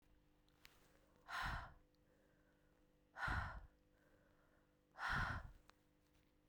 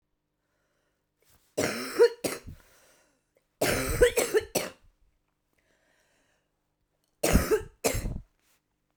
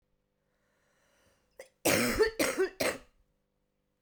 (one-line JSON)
{"exhalation_length": "6.5 s", "exhalation_amplitude": 858, "exhalation_signal_mean_std_ratio": 0.41, "three_cough_length": "9.0 s", "three_cough_amplitude": 12841, "three_cough_signal_mean_std_ratio": 0.35, "cough_length": "4.0 s", "cough_amplitude": 7597, "cough_signal_mean_std_ratio": 0.39, "survey_phase": "beta (2021-08-13 to 2022-03-07)", "age": "18-44", "gender": "Female", "wearing_mask": "No", "symptom_cough_any": true, "symptom_runny_or_blocked_nose": true, "symptom_sore_throat": true, "symptom_fatigue": true, "symptom_headache": true, "symptom_change_to_sense_of_smell_or_taste": true, "symptom_onset": "2 days", "smoker_status": "Current smoker (1 to 10 cigarettes per day)", "respiratory_condition_asthma": true, "respiratory_condition_other": false, "recruitment_source": "Test and Trace", "submission_delay": "1 day", "covid_test_result": "Positive", "covid_test_method": "RT-qPCR", "covid_ct_value": 17.6, "covid_ct_gene": "ORF1ab gene", "covid_ct_mean": 18.3, "covid_viral_load": "980000 copies/ml", "covid_viral_load_category": "Low viral load (10K-1M copies/ml)"}